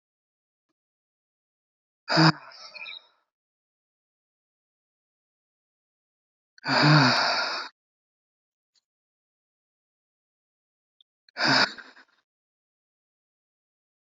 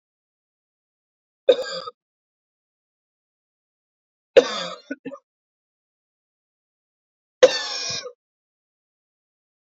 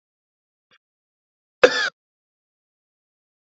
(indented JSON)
{
  "exhalation_length": "14.1 s",
  "exhalation_amplitude": 18107,
  "exhalation_signal_mean_std_ratio": 0.26,
  "three_cough_length": "9.6 s",
  "three_cough_amplitude": 29449,
  "three_cough_signal_mean_std_ratio": 0.19,
  "cough_length": "3.6 s",
  "cough_amplitude": 32768,
  "cough_signal_mean_std_ratio": 0.15,
  "survey_phase": "beta (2021-08-13 to 2022-03-07)",
  "age": "18-44",
  "gender": "Female",
  "wearing_mask": "No",
  "symptom_cough_any": true,
  "symptom_runny_or_blocked_nose": true,
  "symptom_sore_throat": true,
  "symptom_headache": true,
  "smoker_status": "Ex-smoker",
  "respiratory_condition_asthma": false,
  "respiratory_condition_other": false,
  "recruitment_source": "Test and Trace",
  "submission_delay": "1 day",
  "covid_test_result": "Positive",
  "covid_test_method": "RT-qPCR",
  "covid_ct_value": 30.7,
  "covid_ct_gene": "N gene"
}